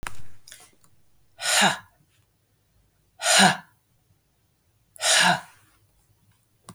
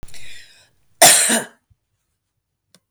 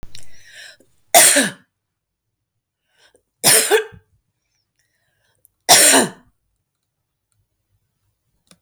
{"exhalation_length": "6.7 s", "exhalation_amplitude": 26243, "exhalation_signal_mean_std_ratio": 0.36, "cough_length": "2.9 s", "cough_amplitude": 32768, "cough_signal_mean_std_ratio": 0.34, "three_cough_length": "8.6 s", "three_cough_amplitude": 32768, "three_cough_signal_mean_std_ratio": 0.31, "survey_phase": "beta (2021-08-13 to 2022-03-07)", "age": "65+", "gender": "Female", "wearing_mask": "No", "symptom_none": true, "smoker_status": "Ex-smoker", "respiratory_condition_asthma": false, "respiratory_condition_other": false, "recruitment_source": "REACT", "submission_delay": "4 days", "covid_test_result": "Negative", "covid_test_method": "RT-qPCR", "influenza_a_test_result": "Unknown/Void", "influenza_b_test_result": "Unknown/Void"}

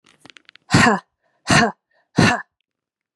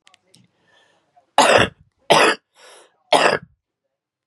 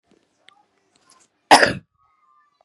{"exhalation_length": "3.2 s", "exhalation_amplitude": 30409, "exhalation_signal_mean_std_ratio": 0.38, "three_cough_length": "4.3 s", "three_cough_amplitude": 32767, "three_cough_signal_mean_std_ratio": 0.34, "cough_length": "2.6 s", "cough_amplitude": 32768, "cough_signal_mean_std_ratio": 0.2, "survey_phase": "beta (2021-08-13 to 2022-03-07)", "age": "18-44", "gender": "Female", "wearing_mask": "No", "symptom_cough_any": true, "symptom_runny_or_blocked_nose": true, "symptom_change_to_sense_of_smell_or_taste": true, "symptom_onset": "3 days", "smoker_status": "Never smoked", "respiratory_condition_asthma": true, "respiratory_condition_other": false, "recruitment_source": "Test and Trace", "submission_delay": "1 day", "covid_test_result": "Negative", "covid_test_method": "RT-qPCR"}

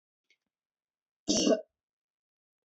{"cough_length": "2.6 s", "cough_amplitude": 6650, "cough_signal_mean_std_ratio": 0.27, "survey_phase": "beta (2021-08-13 to 2022-03-07)", "age": "45-64", "gender": "Female", "wearing_mask": "No", "symptom_none": true, "smoker_status": "Never smoked", "respiratory_condition_asthma": false, "respiratory_condition_other": false, "recruitment_source": "REACT", "submission_delay": "2 days", "covid_test_result": "Negative", "covid_test_method": "RT-qPCR", "influenza_a_test_result": "Negative", "influenza_b_test_result": "Negative"}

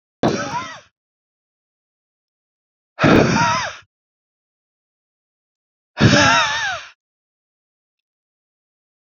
{"exhalation_length": "9.0 s", "exhalation_amplitude": 32767, "exhalation_signal_mean_std_ratio": 0.35, "survey_phase": "beta (2021-08-13 to 2022-03-07)", "age": "65+", "gender": "Male", "wearing_mask": "No", "symptom_none": true, "smoker_status": "Never smoked", "respiratory_condition_asthma": false, "respiratory_condition_other": false, "recruitment_source": "REACT", "submission_delay": "1 day", "covid_test_result": "Negative", "covid_test_method": "RT-qPCR", "influenza_a_test_result": "Unknown/Void", "influenza_b_test_result": "Unknown/Void"}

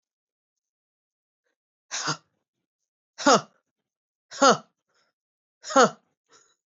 {"exhalation_length": "6.7 s", "exhalation_amplitude": 18658, "exhalation_signal_mean_std_ratio": 0.22, "survey_phase": "beta (2021-08-13 to 2022-03-07)", "age": "18-44", "gender": "Female", "wearing_mask": "No", "symptom_cough_any": true, "symptom_runny_or_blocked_nose": true, "symptom_sore_throat": true, "symptom_fatigue": true, "symptom_headache": true, "symptom_change_to_sense_of_smell_or_taste": true, "smoker_status": "Never smoked", "respiratory_condition_asthma": false, "respiratory_condition_other": false, "recruitment_source": "Test and Trace", "submission_delay": "2 days", "covid_test_result": "Positive", "covid_test_method": "ePCR"}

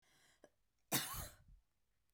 {"cough_length": "2.1 s", "cough_amplitude": 2132, "cough_signal_mean_std_ratio": 0.33, "survey_phase": "beta (2021-08-13 to 2022-03-07)", "age": "45-64", "gender": "Female", "wearing_mask": "No", "symptom_cough_any": true, "symptom_runny_or_blocked_nose": true, "symptom_headache": true, "smoker_status": "Never smoked", "respiratory_condition_asthma": false, "respiratory_condition_other": false, "recruitment_source": "Test and Trace", "submission_delay": "2 days", "covid_test_result": "Positive", "covid_test_method": "ePCR"}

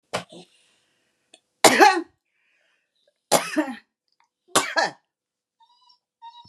{"three_cough_length": "6.5 s", "three_cough_amplitude": 32767, "three_cough_signal_mean_std_ratio": 0.27, "survey_phase": "beta (2021-08-13 to 2022-03-07)", "age": "45-64", "gender": "Female", "wearing_mask": "Yes", "symptom_diarrhoea": true, "symptom_fatigue": true, "symptom_onset": "6 days", "smoker_status": "Ex-smoker", "respiratory_condition_asthma": false, "respiratory_condition_other": false, "recruitment_source": "REACT", "submission_delay": "1 day", "covid_test_result": "Negative", "covid_test_method": "RT-qPCR", "influenza_a_test_result": "Negative", "influenza_b_test_result": "Negative"}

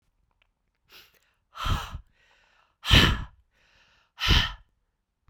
{"exhalation_length": "5.3 s", "exhalation_amplitude": 23973, "exhalation_signal_mean_std_ratio": 0.3, "survey_phase": "beta (2021-08-13 to 2022-03-07)", "age": "18-44", "gender": "Female", "wearing_mask": "No", "symptom_cough_any": true, "symptom_runny_or_blocked_nose": true, "symptom_shortness_of_breath": true, "symptom_fatigue": true, "symptom_headache": true, "symptom_change_to_sense_of_smell_or_taste": true, "symptom_onset": "3 days", "smoker_status": "Never smoked", "respiratory_condition_asthma": false, "respiratory_condition_other": false, "recruitment_source": "Test and Trace", "submission_delay": "2 days", "covid_test_result": "Positive", "covid_test_method": "RT-qPCR"}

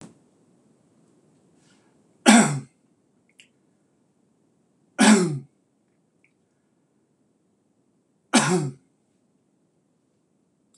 {"three_cough_length": "10.8 s", "three_cough_amplitude": 25973, "three_cough_signal_mean_std_ratio": 0.24, "survey_phase": "beta (2021-08-13 to 2022-03-07)", "age": "65+", "gender": "Male", "wearing_mask": "No", "symptom_none": true, "smoker_status": "Never smoked", "respiratory_condition_asthma": false, "respiratory_condition_other": false, "recruitment_source": "REACT", "submission_delay": "0 days", "covid_test_result": "Negative", "covid_test_method": "RT-qPCR"}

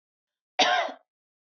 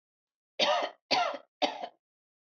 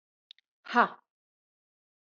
{"cough_length": "1.5 s", "cough_amplitude": 12415, "cough_signal_mean_std_ratio": 0.36, "three_cough_length": "2.6 s", "three_cough_amplitude": 9027, "three_cough_signal_mean_std_ratio": 0.43, "exhalation_length": "2.1 s", "exhalation_amplitude": 12269, "exhalation_signal_mean_std_ratio": 0.18, "survey_phase": "beta (2021-08-13 to 2022-03-07)", "age": "45-64", "gender": "Female", "wearing_mask": "No", "symptom_runny_or_blocked_nose": true, "smoker_status": "Never smoked", "respiratory_condition_asthma": false, "respiratory_condition_other": false, "recruitment_source": "REACT", "submission_delay": "2 days", "covid_test_result": "Negative", "covid_test_method": "RT-qPCR", "influenza_a_test_result": "Negative", "influenza_b_test_result": "Negative"}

